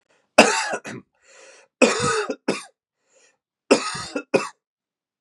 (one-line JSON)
{"three_cough_length": "5.2 s", "three_cough_amplitude": 32768, "three_cough_signal_mean_std_ratio": 0.36, "survey_phase": "beta (2021-08-13 to 2022-03-07)", "age": "18-44", "gender": "Male", "wearing_mask": "No", "symptom_cough_any": true, "symptom_runny_or_blocked_nose": true, "symptom_sore_throat": true, "symptom_fatigue": true, "symptom_onset": "5 days", "smoker_status": "Never smoked", "respiratory_condition_asthma": false, "respiratory_condition_other": false, "recruitment_source": "Test and Trace", "submission_delay": "2 days", "covid_test_result": "Positive", "covid_test_method": "RT-qPCR"}